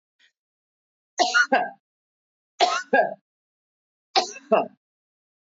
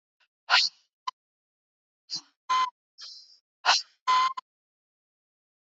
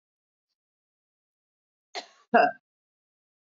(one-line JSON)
{"three_cough_length": "5.5 s", "three_cough_amplitude": 15690, "three_cough_signal_mean_std_ratio": 0.34, "exhalation_length": "5.6 s", "exhalation_amplitude": 15105, "exhalation_signal_mean_std_ratio": 0.32, "cough_length": "3.6 s", "cough_amplitude": 12667, "cough_signal_mean_std_ratio": 0.18, "survey_phase": "beta (2021-08-13 to 2022-03-07)", "age": "65+", "gender": "Female", "wearing_mask": "No", "symptom_runny_or_blocked_nose": true, "symptom_sore_throat": true, "smoker_status": "Never smoked", "respiratory_condition_asthma": false, "respiratory_condition_other": false, "recruitment_source": "Test and Trace", "submission_delay": "1 day", "covid_test_result": "Positive", "covid_test_method": "RT-qPCR", "covid_ct_value": 22.6, "covid_ct_gene": "ORF1ab gene", "covid_ct_mean": 22.9, "covid_viral_load": "31000 copies/ml", "covid_viral_load_category": "Low viral load (10K-1M copies/ml)"}